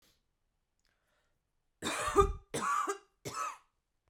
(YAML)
three_cough_length: 4.1 s
three_cough_amplitude: 8381
three_cough_signal_mean_std_ratio: 0.38
survey_phase: beta (2021-08-13 to 2022-03-07)
age: 18-44
gender: Female
wearing_mask: 'No'
symptom_cough_any: true
symptom_sore_throat: true
symptom_fatigue: true
symptom_headache: true
symptom_other: true
symptom_onset: 3 days
smoker_status: Ex-smoker
respiratory_condition_asthma: false
respiratory_condition_other: false
recruitment_source: Test and Trace
submission_delay: 2 days
covid_test_result: Positive
covid_test_method: RT-qPCR
covid_ct_value: 33.4
covid_ct_gene: N gene